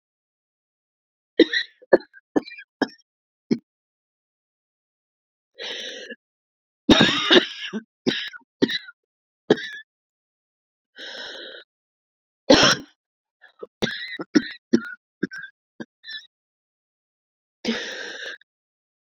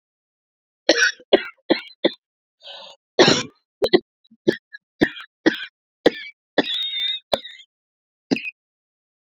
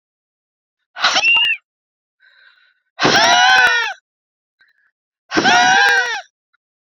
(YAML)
three_cough_length: 19.1 s
three_cough_amplitude: 30076
three_cough_signal_mean_std_ratio: 0.27
cough_length: 9.4 s
cough_amplitude: 32737
cough_signal_mean_std_ratio: 0.32
exhalation_length: 6.8 s
exhalation_amplitude: 32729
exhalation_signal_mean_std_ratio: 0.51
survey_phase: beta (2021-08-13 to 2022-03-07)
age: 18-44
gender: Female
wearing_mask: 'No'
symptom_cough_any: true
symptom_runny_or_blocked_nose: true
symptom_sore_throat: true
symptom_fatigue: true
symptom_headache: true
symptom_change_to_sense_of_smell_or_taste: true
symptom_loss_of_taste: true
smoker_status: Ex-smoker
respiratory_condition_asthma: false
respiratory_condition_other: false
recruitment_source: Test and Trace
submission_delay: 2 days
covid_test_result: Positive
covid_test_method: RT-qPCR